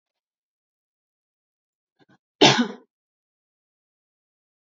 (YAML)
cough_length: 4.6 s
cough_amplitude: 27552
cough_signal_mean_std_ratio: 0.17
survey_phase: beta (2021-08-13 to 2022-03-07)
age: 18-44
gender: Female
wearing_mask: 'No'
symptom_none: true
smoker_status: Never smoked
respiratory_condition_asthma: false
respiratory_condition_other: false
recruitment_source: REACT
submission_delay: 0 days
covid_test_result: Negative
covid_test_method: RT-qPCR